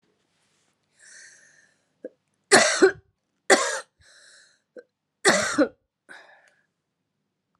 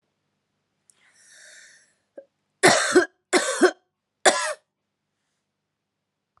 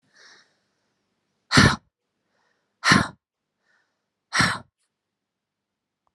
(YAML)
three_cough_length: 7.6 s
three_cough_amplitude: 26809
three_cough_signal_mean_std_ratio: 0.28
cough_length: 6.4 s
cough_amplitude: 27620
cough_signal_mean_std_ratio: 0.29
exhalation_length: 6.1 s
exhalation_amplitude: 29111
exhalation_signal_mean_std_ratio: 0.24
survey_phase: alpha (2021-03-01 to 2021-08-12)
age: 45-64
gender: Female
wearing_mask: 'No'
symptom_cough_any: true
symptom_headache: true
symptom_change_to_sense_of_smell_or_taste: true
symptom_onset: 6 days
smoker_status: Ex-smoker
respiratory_condition_asthma: false
respiratory_condition_other: false
recruitment_source: Test and Trace
submission_delay: 2 days
covid_test_result: Positive
covid_test_method: RT-qPCR